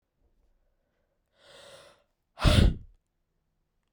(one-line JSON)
{"exhalation_length": "3.9 s", "exhalation_amplitude": 15172, "exhalation_signal_mean_std_ratio": 0.24, "survey_phase": "beta (2021-08-13 to 2022-03-07)", "age": "18-44", "gender": "Female", "wearing_mask": "No", "symptom_cough_any": true, "symptom_runny_or_blocked_nose": true, "symptom_sore_throat": true, "symptom_fatigue": true, "symptom_headache": true, "symptom_change_to_sense_of_smell_or_taste": true, "symptom_loss_of_taste": true, "symptom_onset": "3 days", "smoker_status": "Never smoked", "respiratory_condition_asthma": false, "respiratory_condition_other": false, "recruitment_source": "Test and Trace", "submission_delay": "2 days", "covid_test_result": "Positive", "covid_test_method": "RT-qPCR", "covid_ct_value": 18.8, "covid_ct_gene": "ORF1ab gene"}